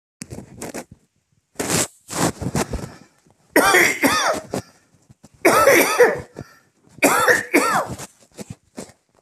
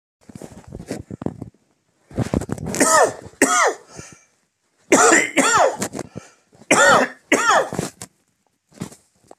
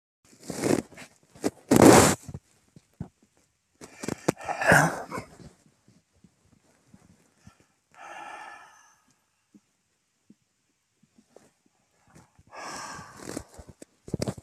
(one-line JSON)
{"cough_length": "9.2 s", "cough_amplitude": 31393, "cough_signal_mean_std_ratio": 0.49, "three_cough_length": "9.4 s", "three_cough_amplitude": 31969, "three_cough_signal_mean_std_ratio": 0.46, "exhalation_length": "14.4 s", "exhalation_amplitude": 26347, "exhalation_signal_mean_std_ratio": 0.24, "survey_phase": "beta (2021-08-13 to 2022-03-07)", "age": "45-64", "gender": "Male", "wearing_mask": "No", "symptom_shortness_of_breath": true, "symptom_fatigue": true, "smoker_status": "Current smoker (1 to 10 cigarettes per day)", "respiratory_condition_asthma": false, "respiratory_condition_other": false, "recruitment_source": "REACT", "submission_delay": "2 days", "covid_test_result": "Negative", "covid_test_method": "RT-qPCR", "influenza_a_test_result": "Unknown/Void", "influenza_b_test_result": "Unknown/Void"}